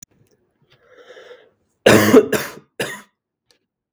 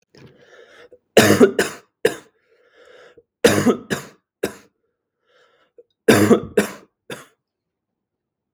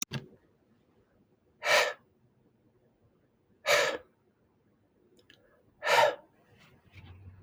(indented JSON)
{
  "cough_length": "3.9 s",
  "cough_amplitude": 32768,
  "cough_signal_mean_std_ratio": 0.3,
  "three_cough_length": "8.5 s",
  "three_cough_amplitude": 32768,
  "three_cough_signal_mean_std_ratio": 0.31,
  "exhalation_length": "7.4 s",
  "exhalation_amplitude": 9471,
  "exhalation_signal_mean_std_ratio": 0.3,
  "survey_phase": "beta (2021-08-13 to 2022-03-07)",
  "age": "18-44",
  "gender": "Male",
  "wearing_mask": "No",
  "symptom_none": true,
  "symptom_onset": "12 days",
  "smoker_status": "Never smoked",
  "respiratory_condition_asthma": false,
  "respiratory_condition_other": false,
  "recruitment_source": "REACT",
  "submission_delay": "2 days",
  "covid_test_result": "Negative",
  "covid_test_method": "RT-qPCR",
  "influenza_a_test_result": "Negative",
  "influenza_b_test_result": "Negative"
}